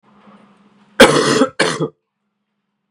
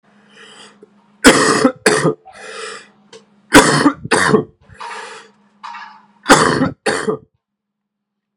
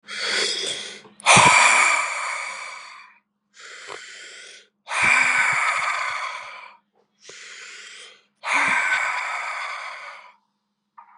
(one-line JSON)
{"cough_length": "2.9 s", "cough_amplitude": 32768, "cough_signal_mean_std_ratio": 0.37, "three_cough_length": "8.4 s", "three_cough_amplitude": 32768, "three_cough_signal_mean_std_ratio": 0.42, "exhalation_length": "11.2 s", "exhalation_amplitude": 29320, "exhalation_signal_mean_std_ratio": 0.54, "survey_phase": "beta (2021-08-13 to 2022-03-07)", "age": "18-44", "gender": "Male", "wearing_mask": "No", "symptom_cough_any": true, "symptom_runny_or_blocked_nose": true, "symptom_sore_throat": true, "symptom_fever_high_temperature": true, "symptom_headache": true, "smoker_status": "Never smoked", "respiratory_condition_asthma": false, "respiratory_condition_other": false, "recruitment_source": "Test and Trace", "submission_delay": "2 days", "covid_test_result": "Positive", "covid_test_method": "RT-qPCR", "covid_ct_value": 21.9, "covid_ct_gene": "N gene"}